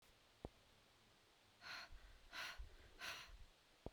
exhalation_length: 3.9 s
exhalation_amplitude: 730
exhalation_signal_mean_std_ratio: 0.61
survey_phase: beta (2021-08-13 to 2022-03-07)
age: 45-64
gender: Female
wearing_mask: 'No'
symptom_none: true
smoker_status: Current smoker (1 to 10 cigarettes per day)
respiratory_condition_asthma: false
respiratory_condition_other: false
recruitment_source: REACT
submission_delay: 0 days
covid_test_result: Negative
covid_test_method: RT-qPCR
influenza_a_test_result: Negative
influenza_b_test_result: Negative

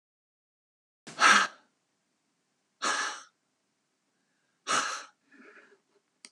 exhalation_length: 6.3 s
exhalation_amplitude: 13368
exhalation_signal_mean_std_ratio: 0.27
survey_phase: alpha (2021-03-01 to 2021-08-12)
age: 65+
gender: Female
wearing_mask: 'No'
symptom_none: true
smoker_status: Never smoked
respiratory_condition_asthma: false
respiratory_condition_other: false
recruitment_source: REACT
submission_delay: 1 day
covid_test_result: Negative
covid_test_method: RT-qPCR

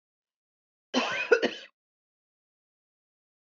cough_length: 3.5 s
cough_amplitude: 14869
cough_signal_mean_std_ratio: 0.26
survey_phase: beta (2021-08-13 to 2022-03-07)
age: 45-64
gender: Female
wearing_mask: 'No'
symptom_runny_or_blocked_nose: true
smoker_status: Never smoked
respiratory_condition_asthma: false
respiratory_condition_other: false
recruitment_source: REACT
submission_delay: 3 days
covid_test_result: Negative
covid_test_method: RT-qPCR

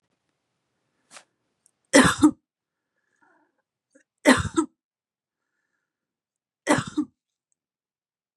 three_cough_length: 8.4 s
three_cough_amplitude: 30043
three_cough_signal_mean_std_ratio: 0.22
survey_phase: beta (2021-08-13 to 2022-03-07)
age: 45-64
gender: Female
wearing_mask: 'No'
symptom_cough_any: true
symptom_new_continuous_cough: true
symptom_runny_or_blocked_nose: true
symptom_sore_throat: true
symptom_fatigue: true
symptom_fever_high_temperature: true
symptom_headache: true
symptom_change_to_sense_of_smell_or_taste: true
symptom_loss_of_taste: true
symptom_onset: 9 days
smoker_status: Ex-smoker
respiratory_condition_asthma: false
respiratory_condition_other: false
recruitment_source: Test and Trace
submission_delay: 2 days
covid_test_result: Positive
covid_test_method: RT-qPCR
covid_ct_value: 18.9
covid_ct_gene: ORF1ab gene
covid_ct_mean: 20.2
covid_viral_load: 230000 copies/ml
covid_viral_load_category: Low viral load (10K-1M copies/ml)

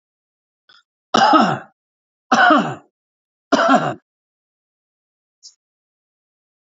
three_cough_length: 6.7 s
three_cough_amplitude: 30843
three_cough_signal_mean_std_ratio: 0.34
survey_phase: alpha (2021-03-01 to 2021-08-12)
age: 45-64
gender: Male
wearing_mask: 'No'
symptom_cough_any: true
symptom_fatigue: true
symptom_headache: true
symptom_onset: 2 days
smoker_status: Never smoked
respiratory_condition_asthma: true
respiratory_condition_other: false
recruitment_source: Test and Trace
submission_delay: 1 day
covid_test_result: Positive
covid_test_method: RT-qPCR
covid_ct_value: 15.9
covid_ct_gene: ORF1ab gene
covid_ct_mean: 16.4
covid_viral_load: 4300000 copies/ml
covid_viral_load_category: High viral load (>1M copies/ml)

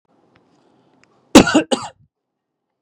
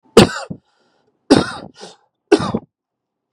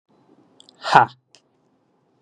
cough_length: 2.8 s
cough_amplitude: 32768
cough_signal_mean_std_ratio: 0.24
three_cough_length: 3.3 s
three_cough_amplitude: 32768
three_cough_signal_mean_std_ratio: 0.29
exhalation_length: 2.2 s
exhalation_amplitude: 32768
exhalation_signal_mean_std_ratio: 0.2
survey_phase: beta (2021-08-13 to 2022-03-07)
age: 18-44
gender: Male
wearing_mask: 'No'
symptom_none: true
smoker_status: Never smoked
respiratory_condition_asthma: false
respiratory_condition_other: false
recruitment_source: REACT
submission_delay: 3 days
covid_test_result: Negative
covid_test_method: RT-qPCR
influenza_a_test_result: Negative
influenza_b_test_result: Negative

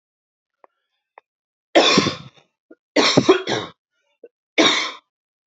three_cough_length: 5.5 s
three_cough_amplitude: 29727
three_cough_signal_mean_std_ratio: 0.37
survey_phase: beta (2021-08-13 to 2022-03-07)
age: 18-44
gender: Female
wearing_mask: 'No'
symptom_none: true
smoker_status: Never smoked
respiratory_condition_asthma: false
respiratory_condition_other: false
recruitment_source: Test and Trace
submission_delay: 2 days
covid_test_result: Negative
covid_test_method: RT-qPCR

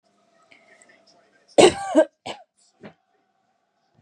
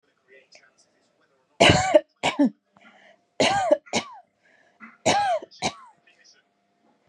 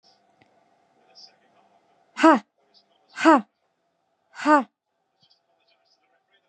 cough_length: 4.0 s
cough_amplitude: 31656
cough_signal_mean_std_ratio: 0.23
three_cough_length: 7.1 s
three_cough_amplitude: 29291
three_cough_signal_mean_std_ratio: 0.36
exhalation_length: 6.5 s
exhalation_amplitude: 29613
exhalation_signal_mean_std_ratio: 0.22
survey_phase: beta (2021-08-13 to 2022-03-07)
age: 18-44
gender: Female
wearing_mask: 'No'
symptom_none: true
smoker_status: Never smoked
respiratory_condition_asthma: false
respiratory_condition_other: false
recruitment_source: REACT
submission_delay: 0 days
covid_test_result: Negative
covid_test_method: RT-qPCR
influenza_a_test_result: Negative
influenza_b_test_result: Negative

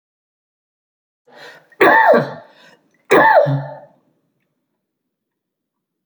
three_cough_length: 6.1 s
three_cough_amplitude: 32467
three_cough_signal_mean_std_ratio: 0.34
survey_phase: beta (2021-08-13 to 2022-03-07)
age: 65+
gender: Male
wearing_mask: 'No'
symptom_cough_any: true
symptom_runny_or_blocked_nose: true
symptom_fatigue: true
symptom_change_to_sense_of_smell_or_taste: true
symptom_onset: 4 days
smoker_status: Never smoked
respiratory_condition_asthma: false
respiratory_condition_other: false
recruitment_source: Test and Trace
submission_delay: 2 days
covid_test_result: Positive
covid_test_method: ePCR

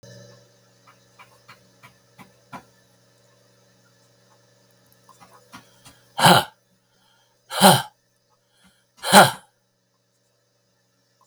exhalation_length: 11.3 s
exhalation_amplitude: 32768
exhalation_signal_mean_std_ratio: 0.21
survey_phase: beta (2021-08-13 to 2022-03-07)
age: 65+
gender: Male
wearing_mask: 'No'
symptom_cough_any: true
symptom_runny_or_blocked_nose: true
symptom_shortness_of_breath: true
symptom_sore_throat: true
symptom_fatigue: true
symptom_other: true
symptom_onset: 5 days
smoker_status: Ex-smoker
respiratory_condition_asthma: true
respiratory_condition_other: false
recruitment_source: Test and Trace
submission_delay: 2 days
covid_test_result: Positive
covid_test_method: RT-qPCR
covid_ct_value: 25.6
covid_ct_gene: N gene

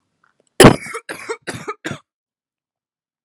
cough_length: 3.2 s
cough_amplitude: 32768
cough_signal_mean_std_ratio: 0.23
survey_phase: alpha (2021-03-01 to 2021-08-12)
age: 18-44
gender: Female
wearing_mask: 'No'
symptom_cough_any: true
symptom_new_continuous_cough: true
symptom_abdominal_pain: true
symptom_diarrhoea: true
symptom_fever_high_temperature: true
symptom_headache: true
symptom_change_to_sense_of_smell_or_taste: true
symptom_onset: 11 days
smoker_status: Prefer not to say
respiratory_condition_asthma: false
respiratory_condition_other: false
recruitment_source: Test and Trace
submission_delay: 3 days
covid_test_result: Positive
covid_test_method: ePCR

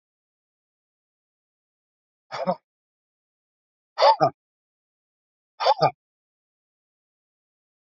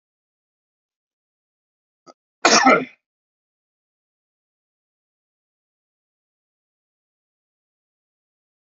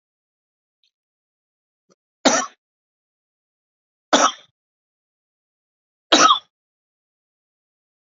exhalation_length: 7.9 s
exhalation_amplitude: 20493
exhalation_signal_mean_std_ratio: 0.21
cough_length: 8.8 s
cough_amplitude: 30392
cough_signal_mean_std_ratio: 0.16
three_cough_length: 8.0 s
three_cough_amplitude: 32767
three_cough_signal_mean_std_ratio: 0.21
survey_phase: alpha (2021-03-01 to 2021-08-12)
age: 45-64
gender: Male
wearing_mask: 'No'
symptom_none: true
smoker_status: Ex-smoker
respiratory_condition_asthma: false
respiratory_condition_other: false
recruitment_source: REACT
submission_delay: 3 days
covid_test_result: Negative
covid_test_method: RT-qPCR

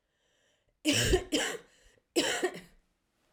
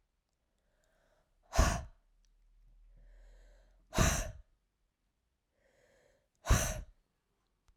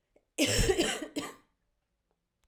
three_cough_length: 3.3 s
three_cough_amplitude: 7050
three_cough_signal_mean_std_ratio: 0.45
exhalation_length: 7.8 s
exhalation_amplitude: 7663
exhalation_signal_mean_std_ratio: 0.27
cough_length: 2.5 s
cough_amplitude: 7767
cough_signal_mean_std_ratio: 0.45
survey_phase: alpha (2021-03-01 to 2021-08-12)
age: 18-44
gender: Female
wearing_mask: 'No'
symptom_shortness_of_breath: true
symptom_fatigue: true
symptom_change_to_sense_of_smell_or_taste: true
symptom_loss_of_taste: true
smoker_status: Never smoked
respiratory_condition_asthma: false
respiratory_condition_other: false
recruitment_source: Test and Trace
submission_delay: 1 day
covid_test_result: Positive
covid_test_method: RT-qPCR
covid_ct_value: 15.3
covid_ct_gene: S gene
covid_ct_mean: 15.4
covid_viral_load: 8700000 copies/ml
covid_viral_load_category: High viral load (>1M copies/ml)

